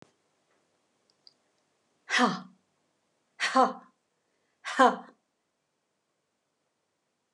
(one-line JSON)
{"exhalation_length": "7.3 s", "exhalation_amplitude": 15708, "exhalation_signal_mean_std_ratio": 0.23, "survey_phase": "alpha (2021-03-01 to 2021-08-12)", "age": "65+", "gender": "Female", "wearing_mask": "No", "symptom_none": true, "smoker_status": "Never smoked", "respiratory_condition_asthma": true, "respiratory_condition_other": false, "recruitment_source": "REACT", "submission_delay": "2 days", "covid_test_result": "Negative", "covid_test_method": "RT-qPCR"}